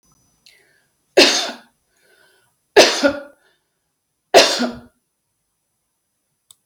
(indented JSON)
{
  "three_cough_length": "6.7 s",
  "three_cough_amplitude": 32768,
  "three_cough_signal_mean_std_ratio": 0.28,
  "survey_phase": "beta (2021-08-13 to 2022-03-07)",
  "age": "65+",
  "gender": "Female",
  "wearing_mask": "No",
  "symptom_none": true,
  "smoker_status": "Never smoked",
  "respiratory_condition_asthma": false,
  "respiratory_condition_other": false,
  "recruitment_source": "REACT",
  "submission_delay": "2 days",
  "covid_test_result": "Negative",
  "covid_test_method": "RT-qPCR",
  "influenza_a_test_result": "Negative",
  "influenza_b_test_result": "Negative"
}